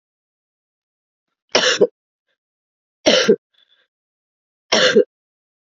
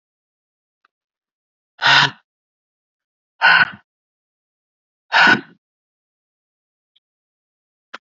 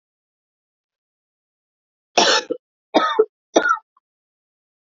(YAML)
three_cough_length: 5.6 s
three_cough_amplitude: 30651
three_cough_signal_mean_std_ratio: 0.31
exhalation_length: 8.1 s
exhalation_amplitude: 29461
exhalation_signal_mean_std_ratio: 0.25
cough_length: 4.9 s
cough_amplitude: 28726
cough_signal_mean_std_ratio: 0.3
survey_phase: beta (2021-08-13 to 2022-03-07)
age: 18-44
gender: Female
wearing_mask: 'No'
symptom_cough_any: true
symptom_shortness_of_breath: true
symptom_sore_throat: true
symptom_diarrhoea: true
symptom_fatigue: true
symptom_fever_high_temperature: true
symptom_headache: true
symptom_onset: 12 days
smoker_status: Never smoked
respiratory_condition_asthma: false
respiratory_condition_other: false
recruitment_source: Test and Trace
submission_delay: 11 days
covid_test_result: Negative
covid_test_method: RT-qPCR